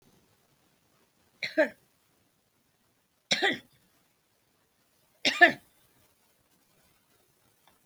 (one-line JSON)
{"three_cough_length": "7.9 s", "three_cough_amplitude": 20546, "three_cough_signal_mean_std_ratio": 0.2, "survey_phase": "alpha (2021-03-01 to 2021-08-12)", "age": "65+", "gender": "Female", "wearing_mask": "Yes", "symptom_prefer_not_to_say": true, "smoker_status": "Current smoker (e-cigarettes or vapes only)", "respiratory_condition_asthma": true, "respiratory_condition_other": false, "recruitment_source": "REACT", "submission_delay": "3 days", "covid_test_result": "Negative", "covid_test_method": "RT-qPCR"}